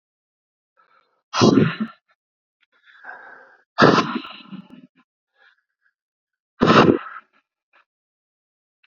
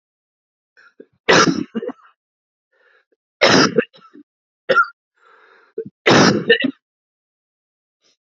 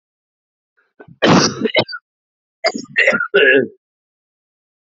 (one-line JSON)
{"exhalation_length": "8.9 s", "exhalation_amplitude": 32768, "exhalation_signal_mean_std_ratio": 0.29, "three_cough_length": "8.3 s", "three_cough_amplitude": 32767, "three_cough_signal_mean_std_ratio": 0.34, "cough_length": "4.9 s", "cough_amplitude": 30745, "cough_signal_mean_std_ratio": 0.41, "survey_phase": "beta (2021-08-13 to 2022-03-07)", "age": "18-44", "gender": "Male", "wearing_mask": "No", "symptom_cough_any": true, "symptom_runny_or_blocked_nose": true, "symptom_sore_throat": true, "symptom_fatigue": true, "symptom_onset": "8 days", "smoker_status": "Never smoked", "respiratory_condition_asthma": false, "respiratory_condition_other": false, "recruitment_source": "Test and Trace", "submission_delay": "1 day", "covid_test_result": "Positive", "covid_test_method": "RT-qPCR", "covid_ct_value": 18.8, "covid_ct_gene": "ORF1ab gene", "covid_ct_mean": 19.3, "covid_viral_load": "470000 copies/ml", "covid_viral_load_category": "Low viral load (10K-1M copies/ml)"}